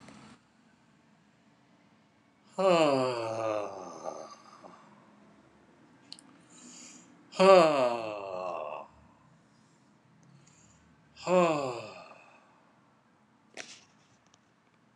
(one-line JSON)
{"exhalation_length": "15.0 s", "exhalation_amplitude": 17638, "exhalation_signal_mean_std_ratio": 0.33, "survey_phase": "alpha (2021-03-01 to 2021-08-12)", "age": "65+", "gender": "Male", "wearing_mask": "No", "symptom_none": true, "smoker_status": "Never smoked", "respiratory_condition_asthma": true, "respiratory_condition_other": false, "recruitment_source": "REACT", "submission_delay": "3 days", "covid_test_result": "Negative", "covid_test_method": "RT-qPCR"}